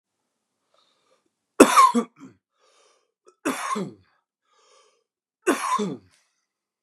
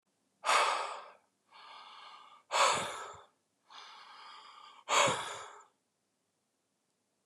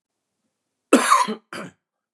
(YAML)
three_cough_length: 6.8 s
three_cough_amplitude: 32768
three_cough_signal_mean_std_ratio: 0.27
exhalation_length: 7.3 s
exhalation_amplitude: 6373
exhalation_signal_mean_std_ratio: 0.38
cough_length: 2.1 s
cough_amplitude: 30611
cough_signal_mean_std_ratio: 0.34
survey_phase: beta (2021-08-13 to 2022-03-07)
age: 18-44
gender: Male
wearing_mask: 'No'
symptom_cough_any: true
symptom_fatigue: true
symptom_headache: true
symptom_change_to_sense_of_smell_or_taste: true
symptom_loss_of_taste: true
smoker_status: Never smoked
respiratory_condition_asthma: false
respiratory_condition_other: false
recruitment_source: Test and Trace
submission_delay: 2 days
covid_test_result: Positive
covid_test_method: RT-qPCR